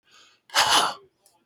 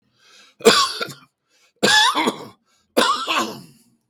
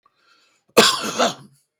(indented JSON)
{
  "exhalation_length": "1.5 s",
  "exhalation_amplitude": 15904,
  "exhalation_signal_mean_std_ratio": 0.43,
  "three_cough_length": "4.1 s",
  "three_cough_amplitude": 32768,
  "three_cough_signal_mean_std_ratio": 0.46,
  "cough_length": "1.8 s",
  "cough_amplitude": 32768,
  "cough_signal_mean_std_ratio": 0.38,
  "survey_phase": "beta (2021-08-13 to 2022-03-07)",
  "age": "65+",
  "gender": "Male",
  "wearing_mask": "No",
  "symptom_cough_any": true,
  "symptom_shortness_of_breath": true,
  "symptom_sore_throat": true,
  "symptom_abdominal_pain": true,
  "symptom_diarrhoea": true,
  "symptom_fatigue": true,
  "symptom_headache": true,
  "symptom_onset": "12 days",
  "smoker_status": "Ex-smoker",
  "respiratory_condition_asthma": true,
  "respiratory_condition_other": false,
  "recruitment_source": "REACT",
  "submission_delay": "2 days",
  "covid_test_result": "Negative",
  "covid_test_method": "RT-qPCR"
}